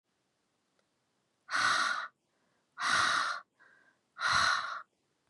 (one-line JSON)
{"exhalation_length": "5.3 s", "exhalation_amplitude": 5713, "exhalation_signal_mean_std_ratio": 0.48, "survey_phase": "beta (2021-08-13 to 2022-03-07)", "age": "18-44", "gender": "Female", "wearing_mask": "No", "symptom_cough_any": true, "symptom_runny_or_blocked_nose": true, "symptom_sore_throat": true, "symptom_fatigue": true, "symptom_headache": true, "symptom_change_to_sense_of_smell_or_taste": true, "symptom_onset": "4 days", "smoker_status": "Never smoked", "respiratory_condition_asthma": false, "respiratory_condition_other": false, "recruitment_source": "Test and Trace", "submission_delay": "2 days", "covid_test_result": "Positive", "covid_test_method": "RT-qPCR", "covid_ct_value": 20.6, "covid_ct_gene": "ORF1ab gene", "covid_ct_mean": 21.0, "covid_viral_load": "130000 copies/ml", "covid_viral_load_category": "Low viral load (10K-1M copies/ml)"}